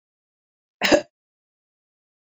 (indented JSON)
{
  "cough_length": "2.2 s",
  "cough_amplitude": 24180,
  "cough_signal_mean_std_ratio": 0.21,
  "survey_phase": "beta (2021-08-13 to 2022-03-07)",
  "age": "45-64",
  "gender": "Female",
  "wearing_mask": "No",
  "symptom_none": true,
  "smoker_status": "Ex-smoker",
  "respiratory_condition_asthma": false,
  "respiratory_condition_other": false,
  "recruitment_source": "REACT",
  "submission_delay": "3 days",
  "covid_test_result": "Negative",
  "covid_test_method": "RT-qPCR",
  "influenza_a_test_result": "Negative",
  "influenza_b_test_result": "Negative"
}